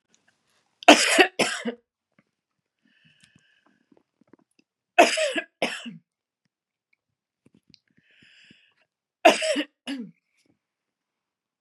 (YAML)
three_cough_length: 11.6 s
three_cough_amplitude: 32514
three_cough_signal_mean_std_ratio: 0.24
survey_phase: beta (2021-08-13 to 2022-03-07)
age: 45-64
gender: Female
wearing_mask: 'No'
symptom_none: true
smoker_status: Never smoked
respiratory_condition_asthma: false
respiratory_condition_other: false
recruitment_source: Test and Trace
submission_delay: 1 day
covid_test_result: Negative
covid_test_method: RT-qPCR